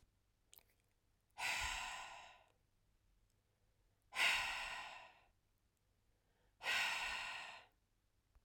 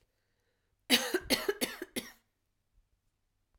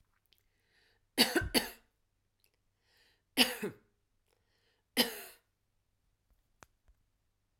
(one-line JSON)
{"exhalation_length": "8.4 s", "exhalation_amplitude": 2495, "exhalation_signal_mean_std_ratio": 0.43, "cough_length": "3.6 s", "cough_amplitude": 9451, "cough_signal_mean_std_ratio": 0.31, "three_cough_length": "7.6 s", "three_cough_amplitude": 9547, "three_cough_signal_mean_std_ratio": 0.23, "survey_phase": "alpha (2021-03-01 to 2021-08-12)", "age": "18-44", "gender": "Female", "wearing_mask": "No", "symptom_none": true, "smoker_status": "Never smoked", "respiratory_condition_asthma": false, "respiratory_condition_other": false, "recruitment_source": "REACT", "submission_delay": "1 day", "covid_test_result": "Negative", "covid_test_method": "RT-qPCR"}